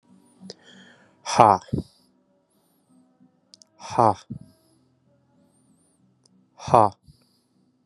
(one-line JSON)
{"exhalation_length": "7.9 s", "exhalation_amplitude": 32768, "exhalation_signal_mean_std_ratio": 0.21, "survey_phase": "beta (2021-08-13 to 2022-03-07)", "age": "18-44", "gender": "Male", "wearing_mask": "No", "symptom_cough_any": true, "symptom_fever_high_temperature": true, "symptom_headache": true, "symptom_onset": "2 days", "smoker_status": "Never smoked", "respiratory_condition_asthma": false, "respiratory_condition_other": false, "recruitment_source": "REACT", "submission_delay": "2 days", "covid_test_result": "Negative", "covid_test_method": "RT-qPCR", "influenza_a_test_result": "Negative", "influenza_b_test_result": "Negative"}